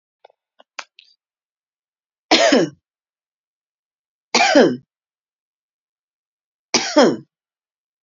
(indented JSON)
{
  "three_cough_length": "8.0 s",
  "three_cough_amplitude": 32725,
  "three_cough_signal_mean_std_ratio": 0.29,
  "survey_phase": "beta (2021-08-13 to 2022-03-07)",
  "age": "45-64",
  "gender": "Female",
  "wearing_mask": "No",
  "symptom_none": true,
  "smoker_status": "Ex-smoker",
  "respiratory_condition_asthma": false,
  "respiratory_condition_other": false,
  "recruitment_source": "REACT",
  "submission_delay": "3 days",
  "covid_test_result": "Negative",
  "covid_test_method": "RT-qPCR",
  "influenza_a_test_result": "Negative",
  "influenza_b_test_result": "Negative"
}